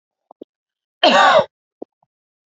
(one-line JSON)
{"cough_length": "2.6 s", "cough_amplitude": 29879, "cough_signal_mean_std_ratio": 0.34, "survey_phase": "beta (2021-08-13 to 2022-03-07)", "age": "18-44", "gender": "Female", "wearing_mask": "No", "symptom_cough_any": true, "symptom_sore_throat": true, "symptom_onset": "4 days", "smoker_status": "Ex-smoker", "respiratory_condition_asthma": false, "respiratory_condition_other": false, "recruitment_source": "REACT", "submission_delay": "2 days", "covid_test_result": "Negative", "covid_test_method": "RT-qPCR"}